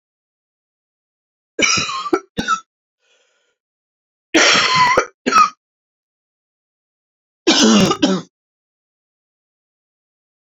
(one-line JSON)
{"three_cough_length": "10.4 s", "three_cough_amplitude": 31143, "three_cough_signal_mean_std_ratio": 0.37, "survey_phase": "beta (2021-08-13 to 2022-03-07)", "age": "45-64", "gender": "Female", "wearing_mask": "No", "symptom_cough_any": true, "symptom_new_continuous_cough": true, "symptom_fatigue": true, "symptom_change_to_sense_of_smell_or_taste": true, "symptom_loss_of_taste": true, "smoker_status": "Ex-smoker", "respiratory_condition_asthma": false, "respiratory_condition_other": false, "recruitment_source": "Test and Trace", "submission_delay": "2 days", "covid_test_result": "Positive", "covid_test_method": "RT-qPCR", "covid_ct_value": 22.2, "covid_ct_gene": "ORF1ab gene"}